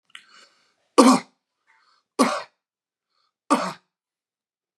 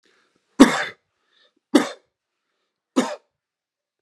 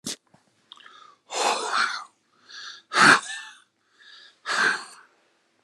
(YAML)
three_cough_length: 4.8 s
three_cough_amplitude: 31852
three_cough_signal_mean_std_ratio: 0.25
cough_length: 4.0 s
cough_amplitude: 32768
cough_signal_mean_std_ratio: 0.23
exhalation_length: 5.6 s
exhalation_amplitude: 26885
exhalation_signal_mean_std_ratio: 0.37
survey_phase: beta (2021-08-13 to 2022-03-07)
age: 45-64
gender: Male
wearing_mask: 'No'
symptom_none: true
smoker_status: Never smoked
respiratory_condition_asthma: false
respiratory_condition_other: false
recruitment_source: REACT
submission_delay: 2 days
covid_test_result: Negative
covid_test_method: RT-qPCR
influenza_a_test_result: Negative
influenza_b_test_result: Negative